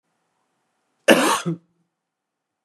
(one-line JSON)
{"cough_length": "2.6 s", "cough_amplitude": 32585, "cough_signal_mean_std_ratio": 0.28, "survey_phase": "beta (2021-08-13 to 2022-03-07)", "age": "45-64", "gender": "Male", "wearing_mask": "No", "symptom_none": true, "smoker_status": "Never smoked", "respiratory_condition_asthma": false, "respiratory_condition_other": false, "recruitment_source": "REACT", "submission_delay": "2 days", "covid_test_result": "Negative", "covid_test_method": "RT-qPCR"}